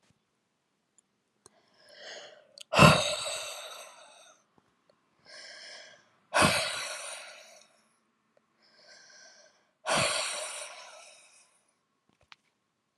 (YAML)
exhalation_length: 13.0 s
exhalation_amplitude: 21345
exhalation_signal_mean_std_ratio: 0.29
survey_phase: alpha (2021-03-01 to 2021-08-12)
age: 45-64
gender: Female
wearing_mask: 'No'
symptom_cough_any: true
symptom_fatigue: true
symptom_change_to_sense_of_smell_or_taste: true
symptom_loss_of_taste: true
symptom_onset: 4 days
smoker_status: Never smoked
respiratory_condition_asthma: false
respiratory_condition_other: false
recruitment_source: Test and Trace
submission_delay: 2 days
covid_test_result: Positive
covid_test_method: RT-qPCR
covid_ct_value: 21.5
covid_ct_gene: ORF1ab gene
covid_ct_mean: 22.3
covid_viral_load: 48000 copies/ml
covid_viral_load_category: Low viral load (10K-1M copies/ml)